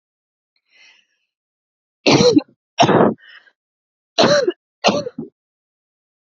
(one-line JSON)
{"cough_length": "6.2 s", "cough_amplitude": 30131, "cough_signal_mean_std_ratio": 0.36, "survey_phase": "beta (2021-08-13 to 2022-03-07)", "age": "18-44", "gender": "Female", "wearing_mask": "No", "symptom_none": true, "smoker_status": "Current smoker (1 to 10 cigarettes per day)", "respiratory_condition_asthma": true, "respiratory_condition_other": false, "recruitment_source": "REACT", "submission_delay": "4 days", "covid_test_result": "Negative", "covid_test_method": "RT-qPCR"}